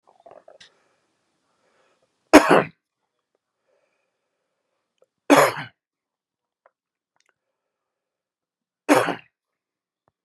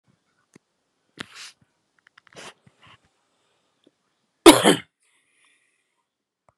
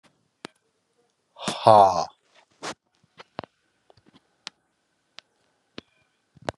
{
  "three_cough_length": "10.2 s",
  "three_cough_amplitude": 32768,
  "three_cough_signal_mean_std_ratio": 0.19,
  "cough_length": "6.6 s",
  "cough_amplitude": 32768,
  "cough_signal_mean_std_ratio": 0.15,
  "exhalation_length": "6.6 s",
  "exhalation_amplitude": 30081,
  "exhalation_signal_mean_std_ratio": 0.2,
  "survey_phase": "beta (2021-08-13 to 2022-03-07)",
  "age": "45-64",
  "gender": "Male",
  "wearing_mask": "No",
  "symptom_cough_any": true,
  "symptom_runny_or_blocked_nose": true,
  "symptom_shortness_of_breath": true,
  "symptom_sore_throat": true,
  "symptom_fatigue": true,
  "symptom_headache": true,
  "symptom_onset": "3 days",
  "smoker_status": "Never smoked",
  "respiratory_condition_asthma": false,
  "respiratory_condition_other": false,
  "recruitment_source": "Test and Trace",
  "submission_delay": "2 days",
  "covid_test_result": "Positive",
  "covid_test_method": "RT-qPCR",
  "covid_ct_value": 14.7,
  "covid_ct_gene": "ORF1ab gene",
  "covid_ct_mean": 15.0,
  "covid_viral_load": "12000000 copies/ml",
  "covid_viral_load_category": "High viral load (>1M copies/ml)"
}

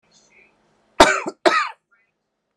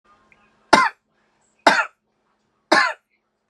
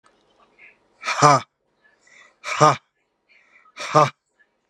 {
  "cough_length": "2.6 s",
  "cough_amplitude": 32768,
  "cough_signal_mean_std_ratio": 0.29,
  "three_cough_length": "3.5 s",
  "three_cough_amplitude": 32768,
  "three_cough_signal_mean_std_ratio": 0.29,
  "exhalation_length": "4.7 s",
  "exhalation_amplitude": 32577,
  "exhalation_signal_mean_std_ratio": 0.29,
  "survey_phase": "beta (2021-08-13 to 2022-03-07)",
  "age": "18-44",
  "gender": "Female",
  "wearing_mask": "No",
  "symptom_cough_any": true,
  "symptom_onset": "2513 days",
  "smoker_status": "Ex-smoker",
  "respiratory_condition_asthma": false,
  "respiratory_condition_other": false,
  "recruitment_source": "Test and Trace",
  "submission_delay": "343 days",
  "covid_test_result": "Negative"
}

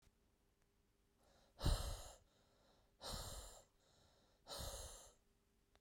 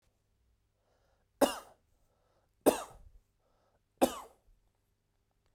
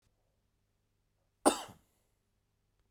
{
  "exhalation_length": "5.8 s",
  "exhalation_amplitude": 1717,
  "exhalation_signal_mean_std_ratio": 0.36,
  "three_cough_length": "5.5 s",
  "three_cough_amplitude": 9315,
  "three_cough_signal_mean_std_ratio": 0.19,
  "cough_length": "2.9 s",
  "cough_amplitude": 9325,
  "cough_signal_mean_std_ratio": 0.15,
  "survey_phase": "beta (2021-08-13 to 2022-03-07)",
  "age": "18-44",
  "gender": "Male",
  "wearing_mask": "No",
  "symptom_none": true,
  "smoker_status": "Never smoked",
  "respiratory_condition_asthma": false,
  "respiratory_condition_other": false,
  "recruitment_source": "Test and Trace",
  "submission_delay": "0 days",
  "covid_test_result": "Negative",
  "covid_test_method": "LFT"
}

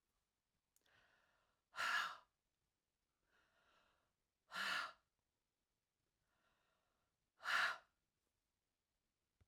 {
  "exhalation_length": "9.5 s",
  "exhalation_amplitude": 1506,
  "exhalation_signal_mean_std_ratio": 0.27,
  "survey_phase": "alpha (2021-03-01 to 2021-08-12)",
  "age": "45-64",
  "gender": "Female",
  "wearing_mask": "No",
  "symptom_none": true,
  "smoker_status": "Never smoked",
  "respiratory_condition_asthma": false,
  "respiratory_condition_other": false,
  "recruitment_source": "REACT",
  "submission_delay": "2 days",
  "covid_test_result": "Negative",
  "covid_test_method": "RT-qPCR"
}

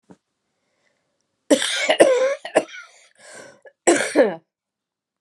{
  "three_cough_length": "5.2 s",
  "three_cough_amplitude": 32767,
  "three_cough_signal_mean_std_ratio": 0.39,
  "survey_phase": "alpha (2021-03-01 to 2021-08-12)",
  "age": "45-64",
  "gender": "Female",
  "wearing_mask": "No",
  "symptom_cough_any": true,
  "symptom_new_continuous_cough": true,
  "symptom_shortness_of_breath": true,
  "symptom_fatigue": true,
  "symptom_headache": true,
  "symptom_change_to_sense_of_smell_or_taste": true,
  "smoker_status": "Never smoked",
  "respiratory_condition_asthma": true,
  "respiratory_condition_other": false,
  "recruitment_source": "Test and Trace",
  "submission_delay": "3 days",
  "covid_test_result": "Positive",
  "covid_test_method": "RT-qPCR",
  "covid_ct_value": 23.6,
  "covid_ct_gene": "ORF1ab gene",
  "covid_ct_mean": 23.7,
  "covid_viral_load": "17000 copies/ml",
  "covid_viral_load_category": "Low viral load (10K-1M copies/ml)"
}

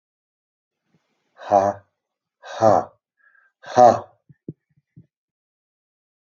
{
  "exhalation_length": "6.2 s",
  "exhalation_amplitude": 27225,
  "exhalation_signal_mean_std_ratio": 0.25,
  "survey_phase": "alpha (2021-03-01 to 2021-08-12)",
  "age": "65+",
  "gender": "Male",
  "wearing_mask": "No",
  "symptom_none": true,
  "smoker_status": "Ex-smoker",
  "respiratory_condition_asthma": false,
  "respiratory_condition_other": false,
  "recruitment_source": "REACT",
  "submission_delay": "1 day",
  "covid_test_result": "Negative",
  "covid_test_method": "RT-qPCR"
}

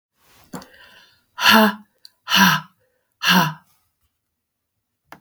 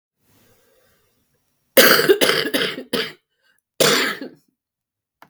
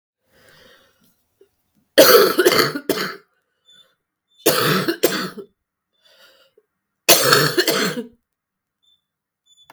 {
  "exhalation_length": "5.2 s",
  "exhalation_amplitude": 32768,
  "exhalation_signal_mean_std_ratio": 0.34,
  "cough_length": "5.3 s",
  "cough_amplitude": 32768,
  "cough_signal_mean_std_ratio": 0.38,
  "three_cough_length": "9.7 s",
  "three_cough_amplitude": 32768,
  "three_cough_signal_mean_std_ratio": 0.38,
  "survey_phase": "beta (2021-08-13 to 2022-03-07)",
  "age": "45-64",
  "gender": "Female",
  "wearing_mask": "No",
  "symptom_cough_any": true,
  "symptom_runny_or_blocked_nose": true,
  "symptom_fatigue": true,
  "symptom_change_to_sense_of_smell_or_taste": true,
  "symptom_loss_of_taste": true,
  "symptom_onset": "12 days",
  "smoker_status": "Current smoker (e-cigarettes or vapes only)",
  "respiratory_condition_asthma": false,
  "respiratory_condition_other": false,
  "recruitment_source": "REACT",
  "submission_delay": "0 days",
  "covid_test_result": "Negative",
  "covid_test_method": "RT-qPCR"
}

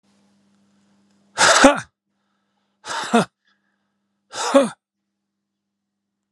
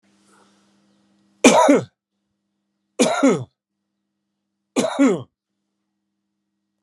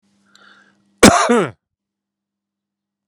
{
  "exhalation_length": "6.3 s",
  "exhalation_amplitude": 32767,
  "exhalation_signal_mean_std_ratio": 0.28,
  "three_cough_length": "6.8 s",
  "three_cough_amplitude": 32768,
  "three_cough_signal_mean_std_ratio": 0.32,
  "cough_length": "3.1 s",
  "cough_amplitude": 32768,
  "cough_signal_mean_std_ratio": 0.28,
  "survey_phase": "alpha (2021-03-01 to 2021-08-12)",
  "age": "45-64",
  "gender": "Male",
  "wearing_mask": "No",
  "symptom_none": true,
  "smoker_status": "Ex-smoker",
  "respiratory_condition_asthma": false,
  "respiratory_condition_other": false,
  "recruitment_source": "REACT",
  "submission_delay": "2 days",
  "covid_test_result": "Negative",
  "covid_test_method": "RT-qPCR"
}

